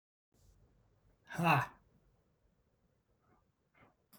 {
  "exhalation_length": "4.2 s",
  "exhalation_amplitude": 6296,
  "exhalation_signal_mean_std_ratio": 0.23,
  "survey_phase": "beta (2021-08-13 to 2022-03-07)",
  "age": "45-64",
  "gender": "Male",
  "wearing_mask": "No",
  "symptom_none": true,
  "smoker_status": "Never smoked",
  "respiratory_condition_asthma": true,
  "respiratory_condition_other": false,
  "recruitment_source": "REACT",
  "submission_delay": "3 days",
  "covid_test_result": "Negative",
  "covid_test_method": "RT-qPCR",
  "influenza_a_test_result": "Negative",
  "influenza_b_test_result": "Negative"
}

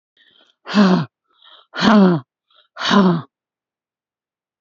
{
  "exhalation_length": "4.6 s",
  "exhalation_amplitude": 30718,
  "exhalation_signal_mean_std_ratio": 0.43,
  "survey_phase": "beta (2021-08-13 to 2022-03-07)",
  "age": "45-64",
  "gender": "Female",
  "wearing_mask": "No",
  "symptom_none": true,
  "smoker_status": "Never smoked",
  "respiratory_condition_asthma": false,
  "respiratory_condition_other": false,
  "recruitment_source": "REACT",
  "submission_delay": "1 day",
  "covid_test_result": "Negative",
  "covid_test_method": "RT-qPCR",
  "influenza_a_test_result": "Negative",
  "influenza_b_test_result": "Negative"
}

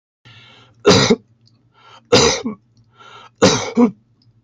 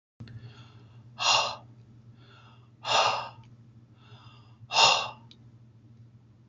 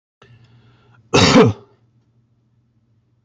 {
  "three_cough_length": "4.4 s",
  "three_cough_amplitude": 32264,
  "three_cough_signal_mean_std_ratio": 0.4,
  "exhalation_length": "6.5 s",
  "exhalation_amplitude": 16677,
  "exhalation_signal_mean_std_ratio": 0.37,
  "cough_length": "3.2 s",
  "cough_amplitude": 29197,
  "cough_signal_mean_std_ratio": 0.3,
  "survey_phase": "beta (2021-08-13 to 2022-03-07)",
  "age": "65+",
  "gender": "Male",
  "wearing_mask": "No",
  "symptom_none": true,
  "smoker_status": "Ex-smoker",
  "respiratory_condition_asthma": false,
  "respiratory_condition_other": false,
  "recruitment_source": "REACT",
  "submission_delay": "1 day",
  "covid_test_result": "Negative",
  "covid_test_method": "RT-qPCR",
  "influenza_a_test_result": "Negative",
  "influenza_b_test_result": "Negative"
}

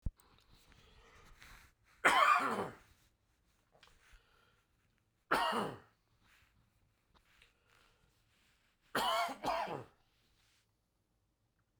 {
  "three_cough_length": "11.8 s",
  "three_cough_amplitude": 6496,
  "three_cough_signal_mean_std_ratio": 0.31,
  "survey_phase": "beta (2021-08-13 to 2022-03-07)",
  "age": "18-44",
  "gender": "Male",
  "wearing_mask": "No",
  "symptom_cough_any": true,
  "symptom_sore_throat": true,
  "smoker_status": "Never smoked",
  "respiratory_condition_asthma": true,
  "respiratory_condition_other": false,
  "recruitment_source": "Test and Trace",
  "submission_delay": "1 day",
  "covid_test_result": "Positive",
  "covid_test_method": "RT-qPCR",
  "covid_ct_value": 12.8,
  "covid_ct_gene": "N gene",
  "covid_ct_mean": 14.2,
  "covid_viral_load": "22000000 copies/ml",
  "covid_viral_load_category": "High viral load (>1M copies/ml)"
}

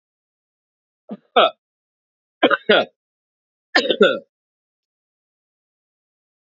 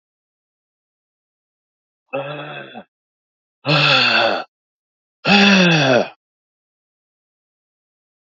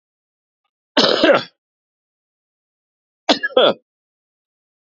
{
  "three_cough_length": "6.6 s",
  "three_cough_amplitude": 31182,
  "three_cough_signal_mean_std_ratio": 0.26,
  "exhalation_length": "8.3 s",
  "exhalation_amplitude": 29069,
  "exhalation_signal_mean_std_ratio": 0.38,
  "cough_length": "4.9 s",
  "cough_amplitude": 30834,
  "cough_signal_mean_std_ratio": 0.3,
  "survey_phase": "beta (2021-08-13 to 2022-03-07)",
  "age": "45-64",
  "gender": "Male",
  "wearing_mask": "No",
  "symptom_cough_any": true,
  "symptom_runny_or_blocked_nose": true,
  "symptom_fatigue": true,
  "symptom_change_to_sense_of_smell_or_taste": true,
  "symptom_loss_of_taste": true,
  "symptom_onset": "3 days",
  "smoker_status": "Never smoked",
  "respiratory_condition_asthma": false,
  "respiratory_condition_other": false,
  "recruitment_source": "Test and Trace",
  "submission_delay": "1 day",
  "covid_test_result": "Positive",
  "covid_test_method": "RT-qPCR",
  "covid_ct_value": 17.7,
  "covid_ct_gene": "ORF1ab gene",
  "covid_ct_mean": 18.2,
  "covid_viral_load": "1100000 copies/ml",
  "covid_viral_load_category": "High viral load (>1M copies/ml)"
}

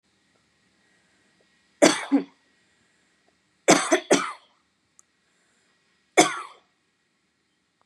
{
  "three_cough_length": "7.9 s",
  "three_cough_amplitude": 31089,
  "three_cough_signal_mean_std_ratio": 0.25,
  "survey_phase": "beta (2021-08-13 to 2022-03-07)",
  "age": "18-44",
  "gender": "Female",
  "wearing_mask": "No",
  "symptom_fatigue": true,
  "symptom_headache": true,
  "symptom_change_to_sense_of_smell_or_taste": true,
  "symptom_loss_of_taste": true,
  "symptom_onset": "3 days",
  "smoker_status": "Never smoked",
  "respiratory_condition_asthma": false,
  "respiratory_condition_other": false,
  "recruitment_source": "REACT",
  "submission_delay": "2 days",
  "covid_test_result": "Positive",
  "covid_test_method": "RT-qPCR",
  "covid_ct_value": 20.0,
  "covid_ct_gene": "E gene",
  "influenza_a_test_result": "Negative",
  "influenza_b_test_result": "Negative"
}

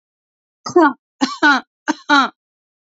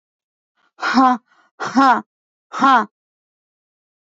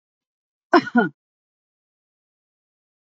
{
  "three_cough_length": "3.0 s",
  "three_cough_amplitude": 27788,
  "three_cough_signal_mean_std_ratio": 0.38,
  "exhalation_length": "4.0 s",
  "exhalation_amplitude": 29225,
  "exhalation_signal_mean_std_ratio": 0.37,
  "cough_length": "3.1 s",
  "cough_amplitude": 27300,
  "cough_signal_mean_std_ratio": 0.2,
  "survey_phase": "beta (2021-08-13 to 2022-03-07)",
  "age": "45-64",
  "gender": "Female",
  "wearing_mask": "No",
  "symptom_none": true,
  "smoker_status": "Never smoked",
  "respiratory_condition_asthma": false,
  "respiratory_condition_other": false,
  "recruitment_source": "REACT",
  "submission_delay": "2 days",
  "covid_test_result": "Negative",
  "covid_test_method": "RT-qPCR",
  "influenza_a_test_result": "Negative",
  "influenza_b_test_result": "Negative"
}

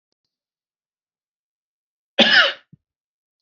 {
  "cough_length": "3.4 s",
  "cough_amplitude": 30340,
  "cough_signal_mean_std_ratio": 0.24,
  "survey_phase": "beta (2021-08-13 to 2022-03-07)",
  "age": "45-64",
  "gender": "Male",
  "wearing_mask": "No",
  "symptom_runny_or_blocked_nose": true,
  "symptom_headache": true,
  "smoker_status": "Never smoked",
  "respiratory_condition_asthma": false,
  "respiratory_condition_other": false,
  "recruitment_source": "REACT",
  "submission_delay": "1 day",
  "covid_test_result": "Negative",
  "covid_test_method": "RT-qPCR"
}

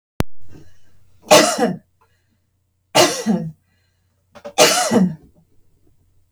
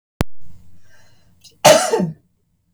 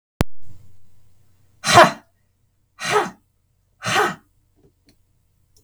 {
  "three_cough_length": "6.3 s",
  "three_cough_amplitude": 32768,
  "three_cough_signal_mean_std_ratio": 0.42,
  "cough_length": "2.7 s",
  "cough_amplitude": 32768,
  "cough_signal_mean_std_ratio": 0.43,
  "exhalation_length": "5.6 s",
  "exhalation_amplitude": 32768,
  "exhalation_signal_mean_std_ratio": 0.34,
  "survey_phase": "beta (2021-08-13 to 2022-03-07)",
  "age": "45-64",
  "gender": "Female",
  "wearing_mask": "No",
  "symptom_none": true,
  "smoker_status": "Never smoked",
  "respiratory_condition_asthma": false,
  "respiratory_condition_other": false,
  "recruitment_source": "REACT",
  "submission_delay": "2 days",
  "covid_test_result": "Negative",
  "covid_test_method": "RT-qPCR",
  "influenza_a_test_result": "Negative",
  "influenza_b_test_result": "Negative"
}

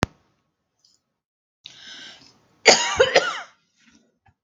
{
  "cough_length": "4.4 s",
  "cough_amplitude": 32768,
  "cough_signal_mean_std_ratio": 0.27,
  "survey_phase": "beta (2021-08-13 to 2022-03-07)",
  "age": "45-64",
  "gender": "Female",
  "wearing_mask": "No",
  "symptom_none": true,
  "smoker_status": "Never smoked",
  "respiratory_condition_asthma": false,
  "respiratory_condition_other": false,
  "recruitment_source": "REACT",
  "submission_delay": "6 days",
  "covid_test_result": "Negative",
  "covid_test_method": "RT-qPCR",
  "influenza_a_test_result": "Negative",
  "influenza_b_test_result": "Negative"
}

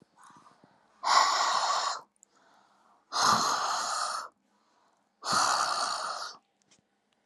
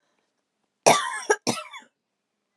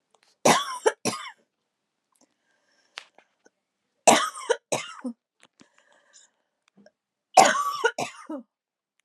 {
  "exhalation_length": "7.3 s",
  "exhalation_amplitude": 13439,
  "exhalation_signal_mean_std_ratio": 0.55,
  "cough_length": "2.6 s",
  "cough_amplitude": 23595,
  "cough_signal_mean_std_ratio": 0.3,
  "three_cough_length": "9.0 s",
  "three_cough_amplitude": 30869,
  "three_cough_signal_mean_std_ratio": 0.28,
  "survey_phase": "alpha (2021-03-01 to 2021-08-12)",
  "age": "45-64",
  "gender": "Female",
  "wearing_mask": "No",
  "symptom_cough_any": true,
  "symptom_fatigue": true,
  "symptom_headache": true,
  "symptom_change_to_sense_of_smell_or_taste": true,
  "symptom_loss_of_taste": true,
  "smoker_status": "Ex-smoker",
  "respiratory_condition_asthma": false,
  "respiratory_condition_other": false,
  "recruitment_source": "Test and Trace",
  "submission_delay": "1 day",
  "covid_test_result": "Positive",
  "covid_test_method": "RT-qPCR",
  "covid_ct_value": 34.3,
  "covid_ct_gene": "N gene"
}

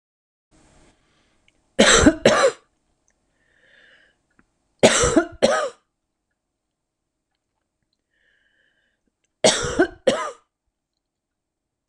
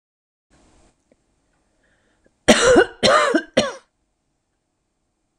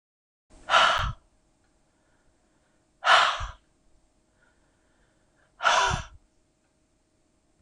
{
  "three_cough_length": "11.9 s",
  "three_cough_amplitude": 26028,
  "three_cough_signal_mean_std_ratio": 0.3,
  "cough_length": "5.4 s",
  "cough_amplitude": 26028,
  "cough_signal_mean_std_ratio": 0.32,
  "exhalation_length": "7.6 s",
  "exhalation_amplitude": 19729,
  "exhalation_signal_mean_std_ratio": 0.31,
  "survey_phase": "beta (2021-08-13 to 2022-03-07)",
  "age": "65+",
  "gender": "Female",
  "wearing_mask": "No",
  "symptom_none": true,
  "symptom_onset": "12 days",
  "smoker_status": "Never smoked",
  "respiratory_condition_asthma": false,
  "respiratory_condition_other": false,
  "recruitment_source": "REACT",
  "submission_delay": "1 day",
  "covid_test_result": "Negative",
  "covid_test_method": "RT-qPCR",
  "influenza_a_test_result": "Negative",
  "influenza_b_test_result": "Negative"
}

